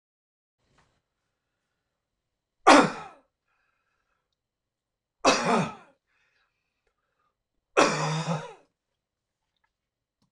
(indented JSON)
{
  "three_cough_length": "10.3 s",
  "three_cough_amplitude": 25890,
  "three_cough_signal_mean_std_ratio": 0.24,
  "survey_phase": "beta (2021-08-13 to 2022-03-07)",
  "age": "65+",
  "gender": "Male",
  "wearing_mask": "No",
  "symptom_none": true,
  "smoker_status": "Never smoked",
  "respiratory_condition_asthma": false,
  "respiratory_condition_other": false,
  "recruitment_source": "REACT",
  "submission_delay": "0 days",
  "covid_test_result": "Negative",
  "covid_test_method": "RT-qPCR"
}